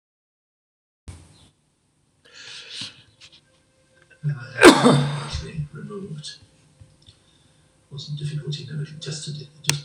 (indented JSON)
{
  "cough_length": "9.8 s",
  "cough_amplitude": 26028,
  "cough_signal_mean_std_ratio": 0.3,
  "survey_phase": "alpha (2021-03-01 to 2021-08-12)",
  "age": "65+",
  "gender": "Male",
  "wearing_mask": "No",
  "symptom_none": true,
  "smoker_status": "Ex-smoker",
  "respiratory_condition_asthma": false,
  "respiratory_condition_other": false,
  "recruitment_source": "REACT",
  "submission_delay": "3 days",
  "covid_test_result": "Negative",
  "covid_test_method": "RT-qPCR"
}